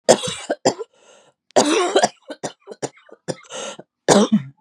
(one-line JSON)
{"three_cough_length": "4.6 s", "three_cough_amplitude": 32768, "three_cough_signal_mean_std_ratio": 0.42, "survey_phase": "beta (2021-08-13 to 2022-03-07)", "age": "18-44", "gender": "Female", "wearing_mask": "No", "symptom_none": true, "smoker_status": "Ex-smoker", "respiratory_condition_asthma": false, "respiratory_condition_other": false, "recruitment_source": "REACT", "submission_delay": "4 days", "covid_test_result": "Negative", "covid_test_method": "RT-qPCR", "influenza_a_test_result": "Negative", "influenza_b_test_result": "Negative"}